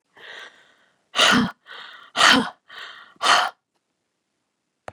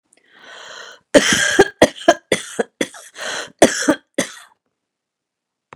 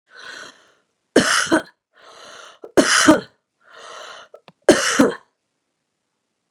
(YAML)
exhalation_length: 4.9 s
exhalation_amplitude: 30025
exhalation_signal_mean_std_ratio: 0.36
cough_length: 5.8 s
cough_amplitude: 32768
cough_signal_mean_std_ratio: 0.34
three_cough_length: 6.5 s
three_cough_amplitude: 32289
three_cough_signal_mean_std_ratio: 0.34
survey_phase: beta (2021-08-13 to 2022-03-07)
age: 65+
gender: Female
wearing_mask: 'No'
symptom_none: true
smoker_status: Never smoked
respiratory_condition_asthma: true
respiratory_condition_other: false
recruitment_source: REACT
submission_delay: 1 day
covid_test_result: Negative
covid_test_method: RT-qPCR
influenza_a_test_result: Negative
influenza_b_test_result: Negative